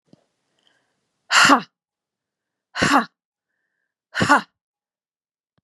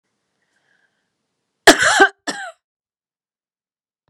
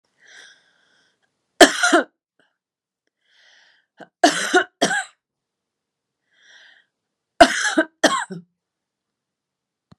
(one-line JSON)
{"exhalation_length": "5.6 s", "exhalation_amplitude": 32553, "exhalation_signal_mean_std_ratio": 0.28, "cough_length": "4.1 s", "cough_amplitude": 32768, "cough_signal_mean_std_ratio": 0.24, "three_cough_length": "10.0 s", "three_cough_amplitude": 32768, "three_cough_signal_mean_std_ratio": 0.26, "survey_phase": "beta (2021-08-13 to 2022-03-07)", "age": "45-64", "gender": "Female", "wearing_mask": "No", "symptom_runny_or_blocked_nose": true, "symptom_headache": true, "symptom_onset": "9 days", "smoker_status": "Ex-smoker", "respiratory_condition_asthma": false, "respiratory_condition_other": false, "recruitment_source": "REACT", "submission_delay": "2 days", "covid_test_result": "Negative", "covid_test_method": "RT-qPCR", "influenza_a_test_result": "Negative", "influenza_b_test_result": "Negative"}